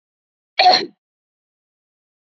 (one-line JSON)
{"cough_length": "2.2 s", "cough_amplitude": 27744, "cough_signal_mean_std_ratio": 0.27, "survey_phase": "beta (2021-08-13 to 2022-03-07)", "age": "18-44", "gender": "Female", "wearing_mask": "No", "symptom_none": true, "smoker_status": "Never smoked", "respiratory_condition_asthma": false, "respiratory_condition_other": false, "recruitment_source": "REACT", "submission_delay": "2 days", "covid_test_result": "Negative", "covid_test_method": "RT-qPCR", "influenza_a_test_result": "Negative", "influenza_b_test_result": "Negative"}